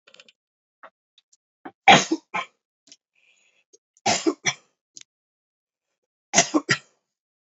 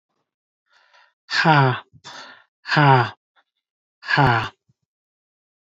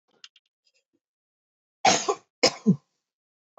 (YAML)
three_cough_length: 7.4 s
three_cough_amplitude: 29155
three_cough_signal_mean_std_ratio: 0.23
exhalation_length: 5.6 s
exhalation_amplitude: 25653
exhalation_signal_mean_std_ratio: 0.37
cough_length: 3.6 s
cough_amplitude: 18732
cough_signal_mean_std_ratio: 0.26
survey_phase: alpha (2021-03-01 to 2021-08-12)
age: 18-44
gender: Male
wearing_mask: 'No'
symptom_none: true
smoker_status: Never smoked
respiratory_condition_asthma: false
respiratory_condition_other: false
recruitment_source: REACT
submission_delay: 2 days
covid_test_result: Negative
covid_test_method: RT-qPCR